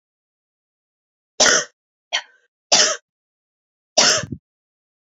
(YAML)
three_cough_length: 5.1 s
three_cough_amplitude: 32768
three_cough_signal_mean_std_ratio: 0.31
survey_phase: beta (2021-08-13 to 2022-03-07)
age: 18-44
gender: Female
wearing_mask: 'No'
symptom_none: true
smoker_status: Never smoked
respiratory_condition_asthma: true
respiratory_condition_other: false
recruitment_source: REACT
submission_delay: 2 days
covid_test_result: Negative
covid_test_method: RT-qPCR
influenza_a_test_result: Negative
influenza_b_test_result: Negative